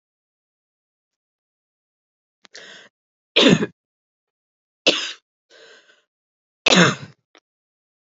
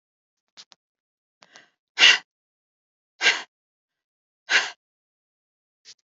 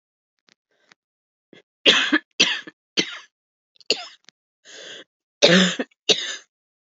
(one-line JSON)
{"three_cough_length": "8.2 s", "three_cough_amplitude": 29435, "three_cough_signal_mean_std_ratio": 0.23, "exhalation_length": "6.1 s", "exhalation_amplitude": 32273, "exhalation_signal_mean_std_ratio": 0.21, "cough_length": "7.0 s", "cough_amplitude": 32767, "cough_signal_mean_std_ratio": 0.31, "survey_phase": "alpha (2021-03-01 to 2021-08-12)", "age": "18-44", "gender": "Female", "wearing_mask": "No", "symptom_cough_any": true, "symptom_diarrhoea": true, "symptom_fatigue": true, "symptom_change_to_sense_of_smell_or_taste": true, "smoker_status": "Never smoked", "respiratory_condition_asthma": true, "respiratory_condition_other": false, "recruitment_source": "Test and Trace", "submission_delay": "2 days", "covid_test_result": "Positive", "covid_test_method": "RT-qPCR", "covid_ct_value": 17.2, "covid_ct_gene": "ORF1ab gene", "covid_ct_mean": 18.4, "covid_viral_load": "920000 copies/ml", "covid_viral_load_category": "Low viral load (10K-1M copies/ml)"}